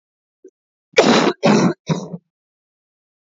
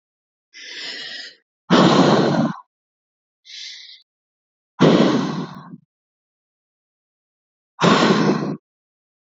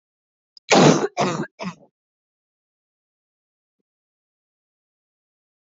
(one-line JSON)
{"cough_length": "3.2 s", "cough_amplitude": 28277, "cough_signal_mean_std_ratio": 0.4, "exhalation_length": "9.2 s", "exhalation_amplitude": 27086, "exhalation_signal_mean_std_ratio": 0.42, "three_cough_length": "5.6 s", "three_cough_amplitude": 26135, "three_cough_signal_mean_std_ratio": 0.25, "survey_phase": "beta (2021-08-13 to 2022-03-07)", "age": "18-44", "gender": "Female", "wearing_mask": "No", "symptom_runny_or_blocked_nose": true, "symptom_headache": true, "symptom_onset": "12 days", "smoker_status": "Never smoked", "respiratory_condition_asthma": true, "respiratory_condition_other": false, "recruitment_source": "REACT", "submission_delay": "3 days", "covid_test_result": "Negative", "covid_test_method": "RT-qPCR", "influenza_a_test_result": "Negative", "influenza_b_test_result": "Negative"}